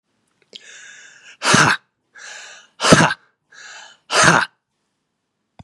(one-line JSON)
{"exhalation_length": "5.6 s", "exhalation_amplitude": 32768, "exhalation_signal_mean_std_ratio": 0.35, "survey_phase": "beta (2021-08-13 to 2022-03-07)", "age": "45-64", "gender": "Male", "wearing_mask": "No", "symptom_none": true, "smoker_status": "Ex-smoker", "respiratory_condition_asthma": false, "respiratory_condition_other": false, "recruitment_source": "Test and Trace", "submission_delay": "0 days", "covid_test_result": "Negative", "covid_test_method": "LFT"}